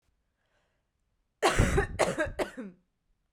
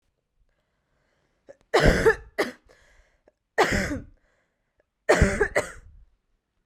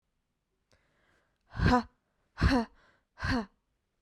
{"cough_length": "3.3 s", "cough_amplitude": 11437, "cough_signal_mean_std_ratio": 0.41, "three_cough_length": "6.7 s", "three_cough_amplitude": 20107, "three_cough_signal_mean_std_ratio": 0.35, "exhalation_length": "4.0 s", "exhalation_amplitude": 8898, "exhalation_signal_mean_std_ratio": 0.33, "survey_phase": "beta (2021-08-13 to 2022-03-07)", "age": "18-44", "gender": "Female", "wearing_mask": "No", "symptom_cough_any": true, "symptom_new_continuous_cough": true, "symptom_runny_or_blocked_nose": true, "symptom_sore_throat": true, "symptom_abdominal_pain": true, "symptom_fatigue": true, "symptom_headache": true, "symptom_onset": "4 days", "smoker_status": "Never smoked", "respiratory_condition_asthma": false, "respiratory_condition_other": false, "recruitment_source": "Test and Trace", "submission_delay": "1 day", "covid_test_result": "Positive", "covid_test_method": "RT-qPCR", "covid_ct_value": 18.8, "covid_ct_gene": "ORF1ab gene"}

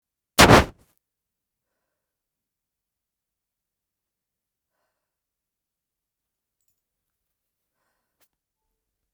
{"exhalation_length": "9.1 s", "exhalation_amplitude": 32768, "exhalation_signal_mean_std_ratio": 0.13, "survey_phase": "beta (2021-08-13 to 2022-03-07)", "age": "65+", "gender": "Female", "wearing_mask": "No", "symptom_none": true, "smoker_status": "Never smoked", "respiratory_condition_asthma": false, "respiratory_condition_other": false, "recruitment_source": "REACT", "submission_delay": "2 days", "covid_test_result": "Negative", "covid_test_method": "RT-qPCR"}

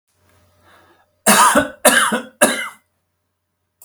{"three_cough_length": "3.8 s", "three_cough_amplitude": 32768, "three_cough_signal_mean_std_ratio": 0.4, "survey_phase": "alpha (2021-03-01 to 2021-08-12)", "age": "65+", "gender": "Male", "wearing_mask": "No", "symptom_none": true, "smoker_status": "Ex-smoker", "respiratory_condition_asthma": false, "respiratory_condition_other": false, "recruitment_source": "REACT", "submission_delay": "4 days", "covid_test_result": "Negative", "covid_test_method": "RT-qPCR"}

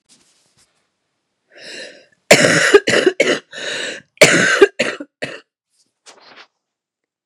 {"cough_length": "7.3 s", "cough_amplitude": 32768, "cough_signal_mean_std_ratio": 0.37, "survey_phase": "beta (2021-08-13 to 2022-03-07)", "age": "45-64", "gender": "Female", "wearing_mask": "No", "symptom_cough_any": true, "symptom_runny_or_blocked_nose": true, "symptom_sore_throat": true, "symptom_fatigue": true, "symptom_headache": true, "symptom_onset": "3 days", "smoker_status": "Ex-smoker", "respiratory_condition_asthma": true, "respiratory_condition_other": false, "recruitment_source": "Test and Trace", "submission_delay": "2 days", "covid_test_result": "Negative", "covid_test_method": "RT-qPCR"}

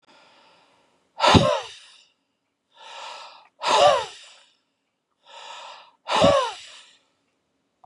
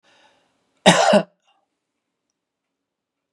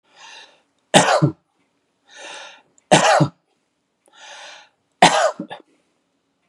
{"exhalation_length": "7.9 s", "exhalation_amplitude": 28266, "exhalation_signal_mean_std_ratio": 0.34, "cough_length": "3.3 s", "cough_amplitude": 32767, "cough_signal_mean_std_ratio": 0.25, "three_cough_length": "6.5 s", "three_cough_amplitude": 32768, "three_cough_signal_mean_std_ratio": 0.33, "survey_phase": "beta (2021-08-13 to 2022-03-07)", "age": "65+", "gender": "Male", "wearing_mask": "No", "symptom_none": true, "smoker_status": "Never smoked", "respiratory_condition_asthma": false, "respiratory_condition_other": false, "recruitment_source": "REACT", "submission_delay": "1 day", "covid_test_result": "Negative", "covid_test_method": "RT-qPCR", "influenza_a_test_result": "Negative", "influenza_b_test_result": "Negative"}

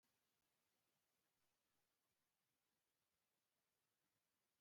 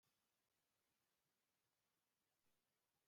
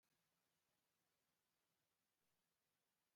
{"exhalation_length": "4.6 s", "exhalation_amplitude": 6, "exhalation_signal_mean_std_ratio": 0.72, "cough_length": "3.1 s", "cough_amplitude": 17, "cough_signal_mean_std_ratio": 0.75, "three_cough_length": "3.2 s", "three_cough_amplitude": 7, "three_cough_signal_mean_std_ratio": 0.75, "survey_phase": "alpha (2021-03-01 to 2021-08-12)", "age": "65+", "gender": "Male", "wearing_mask": "No", "symptom_none": true, "smoker_status": "Ex-smoker", "respiratory_condition_asthma": false, "respiratory_condition_other": true, "recruitment_source": "REACT", "submission_delay": "2 days", "covid_test_result": "Negative", "covid_test_method": "RT-qPCR"}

